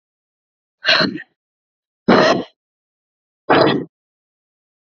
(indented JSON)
{
  "exhalation_length": "4.9 s",
  "exhalation_amplitude": 32230,
  "exhalation_signal_mean_std_ratio": 0.35,
  "survey_phase": "alpha (2021-03-01 to 2021-08-12)",
  "age": "18-44",
  "gender": "Female",
  "wearing_mask": "No",
  "symptom_new_continuous_cough": true,
  "symptom_shortness_of_breath": true,
  "symptom_diarrhoea": true,
  "symptom_headache": true,
  "symptom_change_to_sense_of_smell_or_taste": true,
  "symptom_loss_of_taste": true,
  "symptom_onset": "6 days",
  "smoker_status": "Current smoker (11 or more cigarettes per day)",
  "respiratory_condition_asthma": false,
  "respiratory_condition_other": false,
  "recruitment_source": "Test and Trace",
  "submission_delay": "3 days",
  "covid_test_result": "Positive",
  "covid_test_method": "RT-qPCR",
  "covid_ct_value": 27.8,
  "covid_ct_gene": "ORF1ab gene"
}